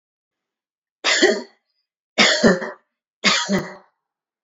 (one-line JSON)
{"three_cough_length": "4.4 s", "three_cough_amplitude": 28114, "three_cough_signal_mean_std_ratio": 0.41, "survey_phase": "beta (2021-08-13 to 2022-03-07)", "age": "45-64", "gender": "Female", "wearing_mask": "No", "symptom_runny_or_blocked_nose": true, "smoker_status": "Ex-smoker", "respiratory_condition_asthma": false, "respiratory_condition_other": false, "recruitment_source": "REACT", "submission_delay": "1 day", "covid_test_result": "Negative", "covid_test_method": "RT-qPCR"}